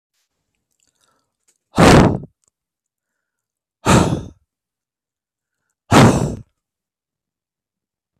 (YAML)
exhalation_length: 8.2 s
exhalation_amplitude: 32768
exhalation_signal_mean_std_ratio: 0.29
survey_phase: beta (2021-08-13 to 2022-03-07)
age: 18-44
gender: Male
wearing_mask: 'No'
symptom_cough_any: true
symptom_runny_or_blocked_nose: true
symptom_sore_throat: true
symptom_onset: 8 days
smoker_status: Never smoked
respiratory_condition_asthma: false
respiratory_condition_other: false
recruitment_source: REACT
submission_delay: 3 days
covid_test_result: Negative
covid_test_method: RT-qPCR
influenza_a_test_result: Negative
influenza_b_test_result: Negative